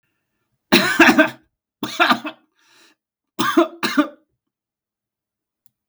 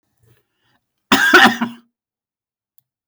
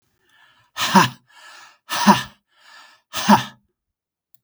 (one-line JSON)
{"three_cough_length": "5.9 s", "three_cough_amplitude": 32768, "three_cough_signal_mean_std_ratio": 0.35, "cough_length": "3.1 s", "cough_amplitude": 32768, "cough_signal_mean_std_ratio": 0.32, "exhalation_length": "4.4 s", "exhalation_amplitude": 32768, "exhalation_signal_mean_std_ratio": 0.32, "survey_phase": "beta (2021-08-13 to 2022-03-07)", "age": "45-64", "gender": "Male", "wearing_mask": "No", "symptom_none": true, "smoker_status": "Never smoked", "respiratory_condition_asthma": false, "respiratory_condition_other": false, "recruitment_source": "REACT", "submission_delay": "3 days", "covid_test_result": "Negative", "covid_test_method": "RT-qPCR"}